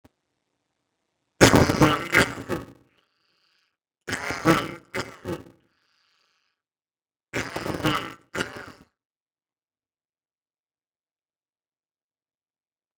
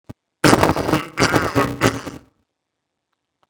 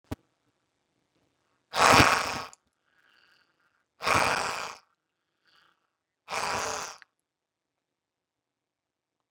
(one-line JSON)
{"three_cough_length": "13.0 s", "three_cough_amplitude": 32455, "three_cough_signal_mean_std_ratio": 0.21, "cough_length": "3.5 s", "cough_amplitude": 32768, "cough_signal_mean_std_ratio": 0.34, "exhalation_length": "9.3 s", "exhalation_amplitude": 25048, "exhalation_signal_mean_std_ratio": 0.23, "survey_phase": "beta (2021-08-13 to 2022-03-07)", "age": "65+", "gender": "Male", "wearing_mask": "No", "symptom_none": true, "smoker_status": "Never smoked", "respiratory_condition_asthma": false, "respiratory_condition_other": false, "recruitment_source": "REACT", "submission_delay": "3 days", "covid_test_result": "Negative", "covid_test_method": "RT-qPCR", "influenza_a_test_result": "Negative", "influenza_b_test_result": "Negative"}